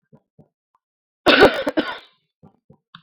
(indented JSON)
{
  "cough_length": "3.0 s",
  "cough_amplitude": 32768,
  "cough_signal_mean_std_ratio": 0.29,
  "survey_phase": "beta (2021-08-13 to 2022-03-07)",
  "age": "18-44",
  "gender": "Female",
  "wearing_mask": "No",
  "symptom_none": true,
  "smoker_status": "Current smoker (11 or more cigarettes per day)",
  "respiratory_condition_asthma": false,
  "respiratory_condition_other": false,
  "recruitment_source": "REACT",
  "submission_delay": "2 days",
  "covid_test_result": "Negative",
  "covid_test_method": "RT-qPCR",
  "influenza_a_test_result": "Negative",
  "influenza_b_test_result": "Negative"
}